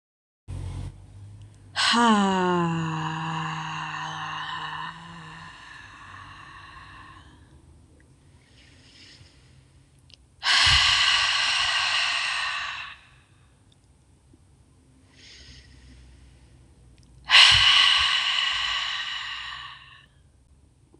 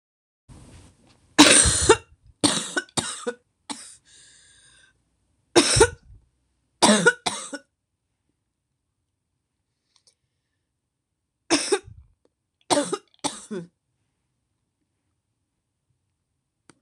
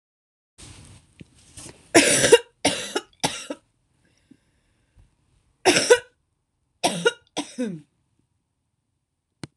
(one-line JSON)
{"exhalation_length": "21.0 s", "exhalation_amplitude": 26013, "exhalation_signal_mean_std_ratio": 0.49, "three_cough_length": "16.8 s", "three_cough_amplitude": 26028, "three_cough_signal_mean_std_ratio": 0.27, "cough_length": "9.6 s", "cough_amplitude": 26028, "cough_signal_mean_std_ratio": 0.28, "survey_phase": "alpha (2021-03-01 to 2021-08-12)", "age": "18-44", "gender": "Female", "wearing_mask": "No", "symptom_cough_any": true, "symptom_new_continuous_cough": true, "symptom_shortness_of_breath": true, "symptom_diarrhoea": true, "symptom_fatigue": true, "symptom_fever_high_temperature": true, "symptom_headache": true, "symptom_onset": "2 days", "smoker_status": "Never smoked", "respiratory_condition_asthma": false, "respiratory_condition_other": false, "recruitment_source": "Test and Trace", "submission_delay": "2 days", "covid_test_result": "Positive", "covid_test_method": "RT-qPCR", "covid_ct_value": 28.4, "covid_ct_gene": "N gene"}